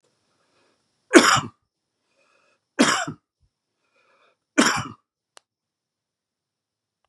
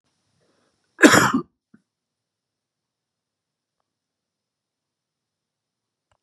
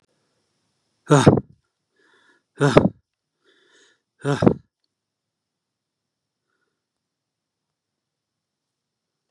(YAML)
three_cough_length: 7.1 s
three_cough_amplitude: 32767
three_cough_signal_mean_std_ratio: 0.24
cough_length: 6.2 s
cough_amplitude: 32768
cough_signal_mean_std_ratio: 0.17
exhalation_length: 9.3 s
exhalation_amplitude: 32768
exhalation_signal_mean_std_ratio: 0.2
survey_phase: beta (2021-08-13 to 2022-03-07)
age: 65+
gender: Male
wearing_mask: 'No'
symptom_abdominal_pain: true
symptom_change_to_sense_of_smell_or_taste: true
symptom_loss_of_taste: true
symptom_onset: 12 days
smoker_status: Ex-smoker
respiratory_condition_asthma: false
respiratory_condition_other: false
recruitment_source: REACT
submission_delay: 1 day
covid_test_result: Negative
covid_test_method: RT-qPCR
influenza_a_test_result: Negative
influenza_b_test_result: Negative